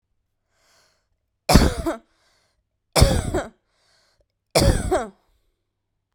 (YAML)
three_cough_length: 6.1 s
three_cough_amplitude: 32768
three_cough_signal_mean_std_ratio: 0.33
survey_phase: beta (2021-08-13 to 2022-03-07)
age: 18-44
gender: Female
wearing_mask: 'No'
symptom_none: true
smoker_status: Current smoker (1 to 10 cigarettes per day)
respiratory_condition_asthma: false
respiratory_condition_other: false
recruitment_source: REACT
submission_delay: 3 days
covid_test_result: Negative
covid_test_method: RT-qPCR
influenza_a_test_result: Negative
influenza_b_test_result: Negative